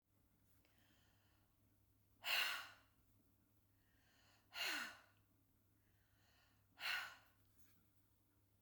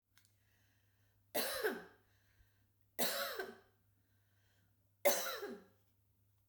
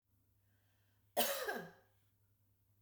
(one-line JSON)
{"exhalation_length": "8.6 s", "exhalation_amplitude": 1361, "exhalation_signal_mean_std_ratio": 0.32, "three_cough_length": "6.5 s", "three_cough_amplitude": 4066, "three_cough_signal_mean_std_ratio": 0.36, "cough_length": "2.8 s", "cough_amplitude": 3016, "cough_signal_mean_std_ratio": 0.32, "survey_phase": "beta (2021-08-13 to 2022-03-07)", "age": "45-64", "gender": "Female", "wearing_mask": "No", "symptom_none": true, "smoker_status": "Ex-smoker", "respiratory_condition_asthma": false, "respiratory_condition_other": false, "recruitment_source": "REACT", "submission_delay": "1 day", "covid_test_result": "Negative", "covid_test_method": "RT-qPCR"}